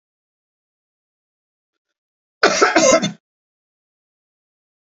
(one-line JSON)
{"cough_length": "4.9 s", "cough_amplitude": 32768, "cough_signal_mean_std_ratio": 0.27, "survey_phase": "beta (2021-08-13 to 2022-03-07)", "age": "45-64", "gender": "Male", "wearing_mask": "No", "symptom_none": true, "smoker_status": "Ex-smoker", "respiratory_condition_asthma": false, "respiratory_condition_other": false, "recruitment_source": "Test and Trace", "submission_delay": "1 day", "covid_test_result": "Positive", "covid_test_method": "RT-qPCR"}